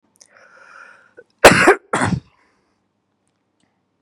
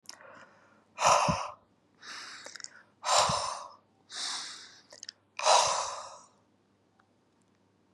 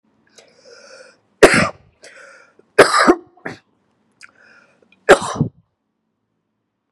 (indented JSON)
{
  "cough_length": "4.0 s",
  "cough_amplitude": 32768,
  "cough_signal_mean_std_ratio": 0.26,
  "exhalation_length": "7.9 s",
  "exhalation_amplitude": 12384,
  "exhalation_signal_mean_std_ratio": 0.4,
  "three_cough_length": "6.9 s",
  "three_cough_amplitude": 32768,
  "three_cough_signal_mean_std_ratio": 0.26,
  "survey_phase": "beta (2021-08-13 to 2022-03-07)",
  "age": "18-44",
  "gender": "Male",
  "wearing_mask": "No",
  "symptom_none": true,
  "symptom_onset": "12 days",
  "smoker_status": "Never smoked",
  "respiratory_condition_asthma": false,
  "respiratory_condition_other": false,
  "recruitment_source": "REACT",
  "submission_delay": "1 day",
  "covid_test_result": "Negative",
  "covid_test_method": "RT-qPCR",
  "influenza_a_test_result": "Negative",
  "influenza_b_test_result": "Negative"
}